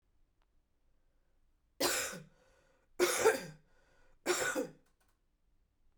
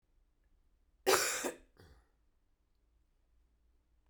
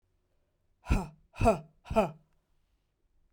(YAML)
three_cough_length: 6.0 s
three_cough_amplitude: 5683
three_cough_signal_mean_std_ratio: 0.36
cough_length: 4.1 s
cough_amplitude: 9970
cough_signal_mean_std_ratio: 0.26
exhalation_length: 3.3 s
exhalation_amplitude: 7912
exhalation_signal_mean_std_ratio: 0.31
survey_phase: beta (2021-08-13 to 2022-03-07)
age: 45-64
gender: Female
wearing_mask: 'No'
symptom_cough_any: true
symptom_runny_or_blocked_nose: true
symptom_fatigue: true
symptom_headache: true
symptom_other: true
symptom_onset: 2 days
smoker_status: Never smoked
respiratory_condition_asthma: false
respiratory_condition_other: false
recruitment_source: Test and Trace
submission_delay: 1 day
covid_test_result: Positive
covid_test_method: RT-qPCR
covid_ct_value: 23.5
covid_ct_gene: ORF1ab gene